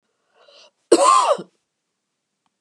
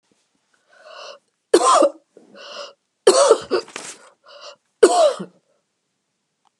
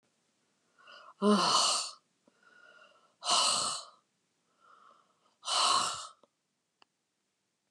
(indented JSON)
{
  "cough_length": "2.6 s",
  "cough_amplitude": 31273,
  "cough_signal_mean_std_ratio": 0.34,
  "three_cough_length": "6.6 s",
  "three_cough_amplitude": 32768,
  "three_cough_signal_mean_std_ratio": 0.35,
  "exhalation_length": "7.7 s",
  "exhalation_amplitude": 6463,
  "exhalation_signal_mean_std_ratio": 0.4,
  "survey_phase": "beta (2021-08-13 to 2022-03-07)",
  "age": "65+",
  "gender": "Female",
  "wearing_mask": "No",
  "symptom_headache": true,
  "smoker_status": "Never smoked",
  "respiratory_condition_asthma": false,
  "respiratory_condition_other": false,
  "recruitment_source": "REACT",
  "submission_delay": "1 day",
  "covid_test_result": "Negative",
  "covid_test_method": "RT-qPCR"
}